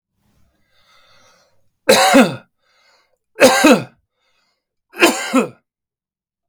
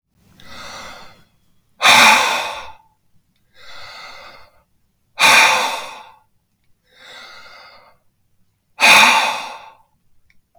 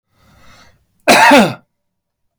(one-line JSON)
{"three_cough_length": "6.5 s", "three_cough_amplitude": 32768, "three_cough_signal_mean_std_ratio": 0.34, "exhalation_length": "10.6 s", "exhalation_amplitude": 32768, "exhalation_signal_mean_std_ratio": 0.36, "cough_length": "2.4 s", "cough_amplitude": 32768, "cough_signal_mean_std_ratio": 0.38, "survey_phase": "beta (2021-08-13 to 2022-03-07)", "age": "45-64", "gender": "Male", "wearing_mask": "No", "symptom_none": true, "smoker_status": "Ex-smoker", "respiratory_condition_asthma": false, "respiratory_condition_other": false, "recruitment_source": "REACT", "submission_delay": "2 days", "covid_test_result": "Negative", "covid_test_method": "RT-qPCR", "influenza_a_test_result": "Negative", "influenza_b_test_result": "Negative"}